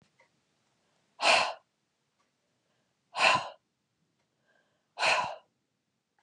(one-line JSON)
{"exhalation_length": "6.2 s", "exhalation_amplitude": 11588, "exhalation_signal_mean_std_ratio": 0.3, "survey_phase": "beta (2021-08-13 to 2022-03-07)", "age": "45-64", "gender": "Female", "wearing_mask": "No", "symptom_none": true, "smoker_status": "Ex-smoker", "respiratory_condition_asthma": false, "respiratory_condition_other": false, "recruitment_source": "REACT", "submission_delay": "3 days", "covid_test_result": "Negative", "covid_test_method": "RT-qPCR", "influenza_a_test_result": "Negative", "influenza_b_test_result": "Negative"}